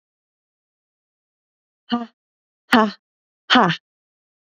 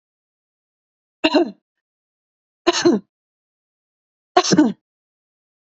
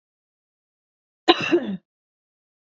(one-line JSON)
{"exhalation_length": "4.4 s", "exhalation_amplitude": 27769, "exhalation_signal_mean_std_ratio": 0.25, "three_cough_length": "5.7 s", "three_cough_amplitude": 27809, "three_cough_signal_mean_std_ratio": 0.29, "cough_length": "2.7 s", "cough_amplitude": 32378, "cough_signal_mean_std_ratio": 0.26, "survey_phase": "beta (2021-08-13 to 2022-03-07)", "age": "18-44", "gender": "Female", "wearing_mask": "No", "symptom_runny_or_blocked_nose": true, "symptom_sore_throat": true, "symptom_change_to_sense_of_smell_or_taste": true, "symptom_loss_of_taste": true, "symptom_onset": "4 days", "smoker_status": "Ex-smoker", "respiratory_condition_asthma": false, "respiratory_condition_other": false, "recruitment_source": "Test and Trace", "submission_delay": "3 days", "covid_test_result": "Positive", "covid_test_method": "RT-qPCR", "covid_ct_value": 22.9, "covid_ct_gene": "ORF1ab gene", "covid_ct_mean": 23.1, "covid_viral_load": "26000 copies/ml", "covid_viral_load_category": "Low viral load (10K-1M copies/ml)"}